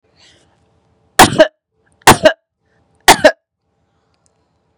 three_cough_length: 4.8 s
three_cough_amplitude: 32768
three_cough_signal_mean_std_ratio: 0.27
survey_phase: beta (2021-08-13 to 2022-03-07)
age: 18-44
gender: Female
wearing_mask: 'No'
symptom_none: true
smoker_status: Current smoker (1 to 10 cigarettes per day)
respiratory_condition_asthma: false
respiratory_condition_other: false
recruitment_source: REACT
submission_delay: 2 days
covid_test_result: Negative
covid_test_method: RT-qPCR
influenza_a_test_result: Negative
influenza_b_test_result: Negative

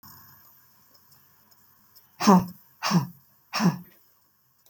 exhalation_length: 4.7 s
exhalation_amplitude: 20932
exhalation_signal_mean_std_ratio: 0.3
survey_phase: beta (2021-08-13 to 2022-03-07)
age: 45-64
gender: Female
wearing_mask: 'No'
symptom_none: true
smoker_status: Ex-smoker
respiratory_condition_asthma: false
respiratory_condition_other: false
recruitment_source: REACT
submission_delay: 1 day
covid_test_result: Negative
covid_test_method: RT-qPCR
influenza_a_test_result: Negative
influenza_b_test_result: Negative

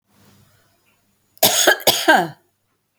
cough_length: 3.0 s
cough_amplitude: 32768
cough_signal_mean_std_ratio: 0.38
survey_phase: beta (2021-08-13 to 2022-03-07)
age: 65+
gender: Female
wearing_mask: 'No'
symptom_none: true
smoker_status: Never smoked
respiratory_condition_asthma: false
respiratory_condition_other: false
recruitment_source: REACT
submission_delay: 2 days
covid_test_result: Negative
covid_test_method: RT-qPCR
influenza_a_test_result: Negative
influenza_b_test_result: Negative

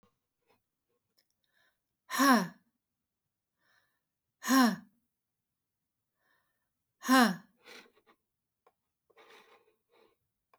exhalation_length: 10.6 s
exhalation_amplitude: 9587
exhalation_signal_mean_std_ratio: 0.24
survey_phase: beta (2021-08-13 to 2022-03-07)
age: 45-64
gender: Female
wearing_mask: 'No'
symptom_none: true
symptom_onset: 3 days
smoker_status: Never smoked
respiratory_condition_asthma: false
respiratory_condition_other: false
recruitment_source: REACT
submission_delay: 1 day
covid_test_result: Negative
covid_test_method: RT-qPCR
influenza_a_test_result: Negative
influenza_b_test_result: Negative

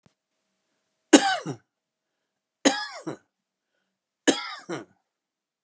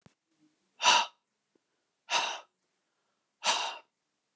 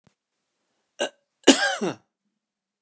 three_cough_length: 5.6 s
three_cough_amplitude: 30867
three_cough_signal_mean_std_ratio: 0.23
exhalation_length: 4.4 s
exhalation_amplitude: 11378
exhalation_signal_mean_std_ratio: 0.31
cough_length: 2.8 s
cough_amplitude: 31174
cough_signal_mean_std_ratio: 0.26
survey_phase: beta (2021-08-13 to 2022-03-07)
age: 65+
gender: Male
wearing_mask: 'No'
symptom_none: true
symptom_onset: 11 days
smoker_status: Ex-smoker
respiratory_condition_asthma: false
respiratory_condition_other: false
recruitment_source: REACT
submission_delay: 2 days
covid_test_result: Negative
covid_test_method: RT-qPCR
influenza_a_test_result: Negative
influenza_b_test_result: Negative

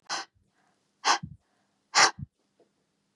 exhalation_length: 3.2 s
exhalation_amplitude: 16582
exhalation_signal_mean_std_ratio: 0.27
survey_phase: beta (2021-08-13 to 2022-03-07)
age: 65+
gender: Female
wearing_mask: 'No'
symptom_cough_any: true
symptom_runny_or_blocked_nose: true
smoker_status: Ex-smoker
respiratory_condition_asthma: false
respiratory_condition_other: false
recruitment_source: REACT
submission_delay: 2 days
covid_test_result: Negative
covid_test_method: RT-qPCR
influenza_a_test_result: Negative
influenza_b_test_result: Negative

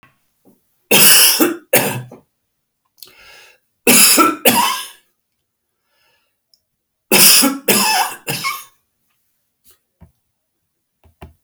three_cough_length: 11.4 s
three_cough_amplitude: 32768
three_cough_signal_mean_std_ratio: 0.39
survey_phase: beta (2021-08-13 to 2022-03-07)
age: 65+
gender: Male
wearing_mask: 'No'
symptom_none: true
smoker_status: Ex-smoker
respiratory_condition_asthma: false
respiratory_condition_other: false
recruitment_source: REACT
submission_delay: 1 day
covid_test_result: Negative
covid_test_method: RT-qPCR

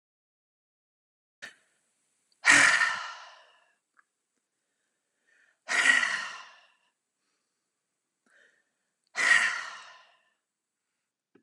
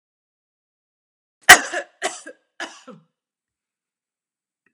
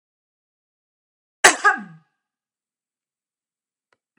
exhalation_length: 11.4 s
exhalation_amplitude: 16632
exhalation_signal_mean_std_ratio: 0.29
three_cough_length: 4.7 s
three_cough_amplitude: 32768
three_cough_signal_mean_std_ratio: 0.15
cough_length: 4.2 s
cough_amplitude: 32767
cough_signal_mean_std_ratio: 0.17
survey_phase: beta (2021-08-13 to 2022-03-07)
age: 45-64
gender: Female
wearing_mask: 'No'
symptom_none: true
smoker_status: Never smoked
respiratory_condition_asthma: false
respiratory_condition_other: false
recruitment_source: REACT
submission_delay: 1 day
covid_test_result: Negative
covid_test_method: RT-qPCR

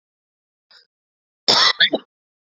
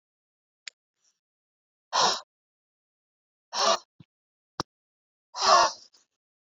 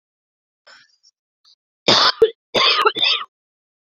cough_length: 2.5 s
cough_amplitude: 32768
cough_signal_mean_std_ratio: 0.31
exhalation_length: 6.6 s
exhalation_amplitude: 16605
exhalation_signal_mean_std_ratio: 0.27
three_cough_length: 3.9 s
three_cough_amplitude: 31316
three_cough_signal_mean_std_ratio: 0.39
survey_phase: beta (2021-08-13 to 2022-03-07)
age: 18-44
gender: Female
wearing_mask: 'No'
symptom_runny_or_blocked_nose: true
symptom_diarrhoea: true
symptom_fever_high_temperature: true
symptom_headache: true
symptom_change_to_sense_of_smell_or_taste: true
symptom_onset: 3 days
smoker_status: Current smoker (11 or more cigarettes per day)
respiratory_condition_asthma: false
respiratory_condition_other: false
recruitment_source: Test and Trace
submission_delay: 2 days
covid_test_result: Positive
covid_test_method: RT-qPCR
covid_ct_value: 20.9
covid_ct_gene: ORF1ab gene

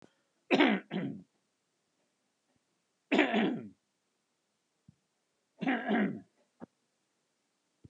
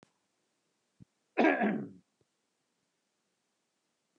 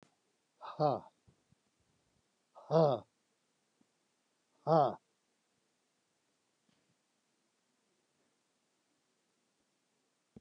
three_cough_length: 7.9 s
three_cough_amplitude: 9310
three_cough_signal_mean_std_ratio: 0.34
cough_length: 4.2 s
cough_amplitude: 6111
cough_signal_mean_std_ratio: 0.26
exhalation_length: 10.4 s
exhalation_amplitude: 5434
exhalation_signal_mean_std_ratio: 0.2
survey_phase: alpha (2021-03-01 to 2021-08-12)
age: 65+
gender: Male
wearing_mask: 'No'
symptom_none: true
smoker_status: Ex-smoker
respiratory_condition_asthma: false
respiratory_condition_other: false
recruitment_source: REACT
submission_delay: 3 days
covid_test_result: Negative
covid_test_method: RT-qPCR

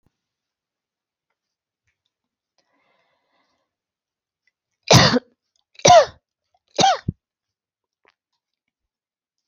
three_cough_length: 9.5 s
three_cough_amplitude: 32767
three_cough_signal_mean_std_ratio: 0.21
survey_phase: alpha (2021-03-01 to 2021-08-12)
age: 45-64
gender: Female
wearing_mask: 'No'
symptom_none: true
smoker_status: Never smoked
respiratory_condition_asthma: false
respiratory_condition_other: false
recruitment_source: REACT
submission_delay: 2 days
covid_test_result: Negative
covid_test_method: RT-qPCR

